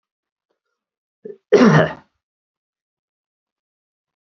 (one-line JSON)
{"cough_length": "4.3 s", "cough_amplitude": 30950, "cough_signal_mean_std_ratio": 0.24, "survey_phase": "beta (2021-08-13 to 2022-03-07)", "age": "45-64", "gender": "Male", "wearing_mask": "No", "symptom_runny_or_blocked_nose": true, "smoker_status": "Never smoked", "respiratory_condition_asthma": false, "respiratory_condition_other": false, "recruitment_source": "REACT", "submission_delay": "5 days", "covid_test_result": "Negative", "covid_test_method": "RT-qPCR"}